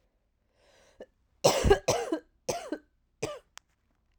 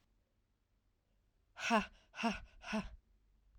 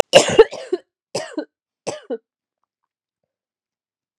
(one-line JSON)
{"three_cough_length": "4.2 s", "three_cough_amplitude": 13496, "three_cough_signal_mean_std_ratio": 0.33, "exhalation_length": "3.6 s", "exhalation_amplitude": 3331, "exhalation_signal_mean_std_ratio": 0.34, "cough_length": "4.2 s", "cough_amplitude": 32768, "cough_signal_mean_std_ratio": 0.24, "survey_phase": "alpha (2021-03-01 to 2021-08-12)", "age": "18-44", "gender": "Female", "wearing_mask": "No", "symptom_cough_any": true, "symptom_fatigue": true, "symptom_headache": true, "symptom_onset": "2 days", "smoker_status": "Never smoked", "respiratory_condition_asthma": false, "respiratory_condition_other": false, "recruitment_source": "Test and Trace", "submission_delay": "1 day", "covid_test_result": "Positive", "covid_test_method": "RT-qPCR", "covid_ct_value": 15.4, "covid_ct_gene": "ORF1ab gene", "covid_ct_mean": 15.8, "covid_viral_load": "6600000 copies/ml", "covid_viral_load_category": "High viral load (>1M copies/ml)"}